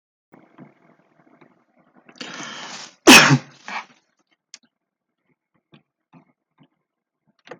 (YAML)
cough_length: 7.6 s
cough_amplitude: 32768
cough_signal_mean_std_ratio: 0.19
survey_phase: beta (2021-08-13 to 2022-03-07)
age: 65+
gender: Male
wearing_mask: 'No'
symptom_none: true
smoker_status: Never smoked
respiratory_condition_asthma: false
respiratory_condition_other: false
recruitment_source: REACT
submission_delay: 11 days
covid_test_result: Negative
covid_test_method: RT-qPCR